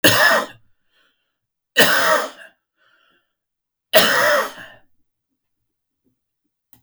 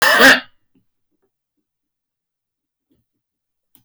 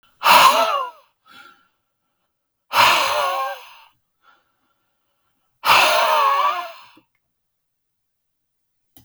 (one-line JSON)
{"three_cough_length": "6.8 s", "three_cough_amplitude": 32768, "three_cough_signal_mean_std_ratio": 0.38, "cough_length": "3.8 s", "cough_amplitude": 30271, "cough_signal_mean_std_ratio": 0.26, "exhalation_length": "9.0 s", "exhalation_amplitude": 32768, "exhalation_signal_mean_std_ratio": 0.42, "survey_phase": "beta (2021-08-13 to 2022-03-07)", "age": "65+", "gender": "Male", "wearing_mask": "No", "symptom_none": true, "smoker_status": "Never smoked", "respiratory_condition_asthma": false, "respiratory_condition_other": false, "recruitment_source": "REACT", "submission_delay": "2 days", "covid_test_result": "Negative", "covid_test_method": "RT-qPCR", "influenza_a_test_result": "Negative", "influenza_b_test_result": "Negative"}